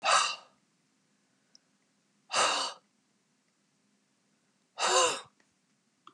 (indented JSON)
{
  "exhalation_length": "6.1 s",
  "exhalation_amplitude": 8610,
  "exhalation_signal_mean_std_ratio": 0.34,
  "survey_phase": "beta (2021-08-13 to 2022-03-07)",
  "age": "65+",
  "gender": "Female",
  "wearing_mask": "No",
  "symptom_none": true,
  "smoker_status": "Prefer not to say",
  "respiratory_condition_asthma": false,
  "respiratory_condition_other": false,
  "recruitment_source": "REACT",
  "submission_delay": "1 day",
  "covid_test_result": "Negative",
  "covid_test_method": "RT-qPCR",
  "influenza_a_test_result": "Negative",
  "influenza_b_test_result": "Negative"
}